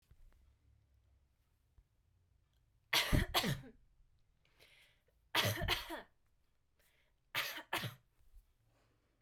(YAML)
three_cough_length: 9.2 s
three_cough_amplitude: 4555
three_cough_signal_mean_std_ratio: 0.32
survey_phase: beta (2021-08-13 to 2022-03-07)
age: 18-44
gender: Female
wearing_mask: 'No'
symptom_none: true
smoker_status: Never smoked
respiratory_condition_asthma: false
respiratory_condition_other: false
recruitment_source: REACT
submission_delay: 1 day
covid_test_result: Negative
covid_test_method: RT-qPCR
influenza_a_test_result: Negative
influenza_b_test_result: Negative